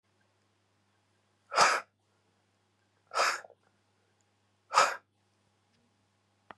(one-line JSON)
{"exhalation_length": "6.6 s", "exhalation_amplitude": 10921, "exhalation_signal_mean_std_ratio": 0.25, "survey_phase": "beta (2021-08-13 to 2022-03-07)", "age": "45-64", "gender": "Male", "wearing_mask": "No", "symptom_cough_any": true, "symptom_new_continuous_cough": true, "symptom_runny_or_blocked_nose": true, "symptom_shortness_of_breath": true, "symptom_sore_throat": true, "symptom_abdominal_pain": true, "symptom_fatigue": true, "symptom_onset": "2 days", "smoker_status": "Ex-smoker", "respiratory_condition_asthma": false, "respiratory_condition_other": false, "recruitment_source": "Test and Trace", "submission_delay": "2 days", "covid_test_result": "Positive", "covid_test_method": "RT-qPCR", "covid_ct_value": 20.1, "covid_ct_gene": "ORF1ab gene", "covid_ct_mean": 20.2, "covid_viral_load": "240000 copies/ml", "covid_viral_load_category": "Low viral load (10K-1M copies/ml)"}